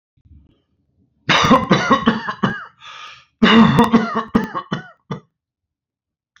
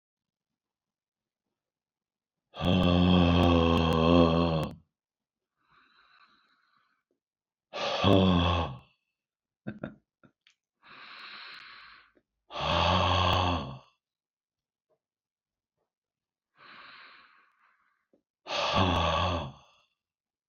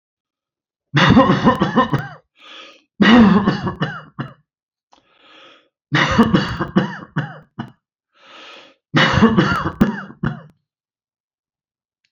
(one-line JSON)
{"cough_length": "6.4 s", "cough_amplitude": 32106, "cough_signal_mean_std_ratio": 0.45, "exhalation_length": "20.5 s", "exhalation_amplitude": 12746, "exhalation_signal_mean_std_ratio": 0.41, "three_cough_length": "12.1 s", "three_cough_amplitude": 32767, "three_cough_signal_mean_std_ratio": 0.45, "survey_phase": "beta (2021-08-13 to 2022-03-07)", "age": "65+", "gender": "Male", "wearing_mask": "No", "symptom_cough_any": true, "smoker_status": "Never smoked", "respiratory_condition_asthma": false, "respiratory_condition_other": false, "recruitment_source": "REACT", "submission_delay": "1 day", "covid_test_result": "Negative", "covid_test_method": "RT-qPCR"}